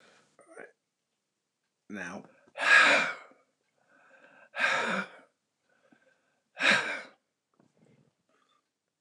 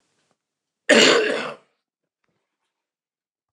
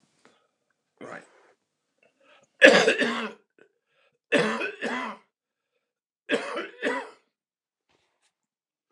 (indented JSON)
{
  "exhalation_length": "9.0 s",
  "exhalation_amplitude": 12975,
  "exhalation_signal_mean_std_ratio": 0.31,
  "cough_length": "3.5 s",
  "cough_amplitude": 28895,
  "cough_signal_mean_std_ratio": 0.3,
  "three_cough_length": "8.9 s",
  "three_cough_amplitude": 29204,
  "three_cough_signal_mean_std_ratio": 0.29,
  "survey_phase": "beta (2021-08-13 to 2022-03-07)",
  "age": "65+",
  "gender": "Male",
  "wearing_mask": "No",
  "symptom_cough_any": true,
  "symptom_new_continuous_cough": true,
  "symptom_runny_or_blocked_nose": true,
  "symptom_shortness_of_breath": true,
  "symptom_sore_throat": true,
  "symptom_fatigue": true,
  "symptom_onset": "12 days",
  "smoker_status": "Never smoked",
  "respiratory_condition_asthma": false,
  "respiratory_condition_other": false,
  "recruitment_source": "REACT",
  "submission_delay": "1 day",
  "covid_test_result": "Negative",
  "covid_test_method": "RT-qPCR",
  "influenza_a_test_result": "Negative",
  "influenza_b_test_result": "Negative"
}